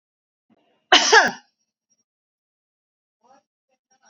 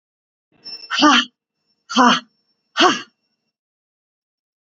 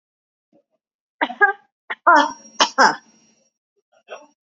{"cough_length": "4.1 s", "cough_amplitude": 30282, "cough_signal_mean_std_ratio": 0.22, "exhalation_length": "4.7 s", "exhalation_amplitude": 32767, "exhalation_signal_mean_std_ratio": 0.33, "three_cough_length": "4.4 s", "three_cough_amplitude": 31451, "three_cough_signal_mean_std_ratio": 0.3, "survey_phase": "beta (2021-08-13 to 2022-03-07)", "age": "45-64", "gender": "Female", "wearing_mask": "No", "symptom_none": true, "symptom_onset": "9 days", "smoker_status": "Ex-smoker", "respiratory_condition_asthma": false, "respiratory_condition_other": false, "recruitment_source": "Test and Trace", "submission_delay": "7 days", "covid_test_result": "Positive", "covid_test_method": "ePCR"}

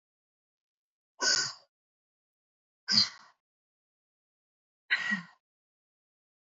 {"exhalation_length": "6.5 s", "exhalation_amplitude": 11224, "exhalation_signal_mean_std_ratio": 0.26, "survey_phase": "alpha (2021-03-01 to 2021-08-12)", "age": "18-44", "gender": "Female", "wearing_mask": "No", "symptom_none": true, "smoker_status": "Never smoked", "respiratory_condition_asthma": false, "respiratory_condition_other": false, "recruitment_source": "REACT", "submission_delay": "2 days", "covid_test_result": "Negative", "covid_test_method": "RT-qPCR"}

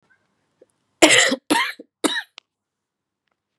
{"three_cough_length": "3.6 s", "three_cough_amplitude": 32767, "three_cough_signal_mean_std_ratio": 0.32, "survey_phase": "beta (2021-08-13 to 2022-03-07)", "age": "18-44", "gender": "Female", "wearing_mask": "No", "symptom_cough_any": true, "symptom_new_continuous_cough": true, "symptom_shortness_of_breath": true, "symptom_fatigue": true, "symptom_headache": true, "symptom_change_to_sense_of_smell_or_taste": true, "symptom_loss_of_taste": true, "symptom_onset": "7 days", "smoker_status": "Never smoked", "respiratory_condition_asthma": false, "respiratory_condition_other": false, "recruitment_source": "Test and Trace", "submission_delay": "2 days", "covid_test_result": "Positive", "covid_test_method": "RT-qPCR"}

